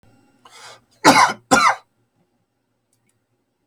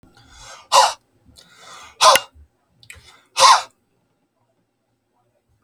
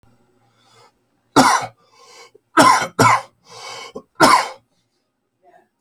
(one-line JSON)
{"cough_length": "3.7 s", "cough_amplitude": 32768, "cough_signal_mean_std_ratio": 0.3, "exhalation_length": "5.6 s", "exhalation_amplitude": 32767, "exhalation_signal_mean_std_ratio": 0.27, "three_cough_length": "5.8 s", "three_cough_amplitude": 32768, "three_cough_signal_mean_std_ratio": 0.36, "survey_phase": "alpha (2021-03-01 to 2021-08-12)", "age": "18-44", "gender": "Male", "wearing_mask": "No", "symptom_cough_any": true, "smoker_status": "Never smoked", "respiratory_condition_asthma": true, "respiratory_condition_other": false, "recruitment_source": "Test and Trace", "submission_delay": "2 days", "covid_test_result": "Positive", "covid_test_method": "RT-qPCR"}